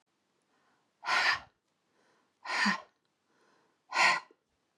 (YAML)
exhalation_length: 4.8 s
exhalation_amplitude: 8215
exhalation_signal_mean_std_ratio: 0.35
survey_phase: beta (2021-08-13 to 2022-03-07)
age: 45-64
gender: Female
wearing_mask: 'No'
symptom_none: true
smoker_status: Never smoked
respiratory_condition_asthma: true
respiratory_condition_other: true
recruitment_source: REACT
submission_delay: 2 days
covid_test_result: Negative
covid_test_method: RT-qPCR
influenza_a_test_result: Negative
influenza_b_test_result: Negative